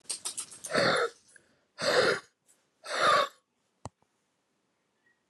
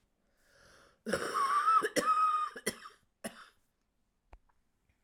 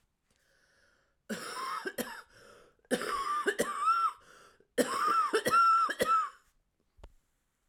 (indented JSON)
{
  "exhalation_length": "5.3 s",
  "exhalation_amplitude": 8745,
  "exhalation_signal_mean_std_ratio": 0.41,
  "cough_length": "5.0 s",
  "cough_amplitude": 5289,
  "cough_signal_mean_std_ratio": 0.47,
  "three_cough_length": "7.7 s",
  "three_cough_amplitude": 7437,
  "three_cough_signal_mean_std_ratio": 0.55,
  "survey_phase": "alpha (2021-03-01 to 2021-08-12)",
  "age": "45-64",
  "gender": "Female",
  "wearing_mask": "No",
  "symptom_cough_any": true,
  "symptom_shortness_of_breath": true,
  "symptom_fatigue": true,
  "symptom_headache": true,
  "symptom_change_to_sense_of_smell_or_taste": true,
  "smoker_status": "Current smoker (1 to 10 cigarettes per day)",
  "respiratory_condition_asthma": true,
  "respiratory_condition_other": false,
  "recruitment_source": "Test and Trace",
  "submission_delay": "5 days",
  "covid_test_result": "Positive",
  "covid_test_method": "RT-qPCR",
  "covid_ct_value": 21.8,
  "covid_ct_gene": "ORF1ab gene",
  "covid_ct_mean": 22.2,
  "covid_viral_load": "53000 copies/ml",
  "covid_viral_load_category": "Low viral load (10K-1M copies/ml)"
}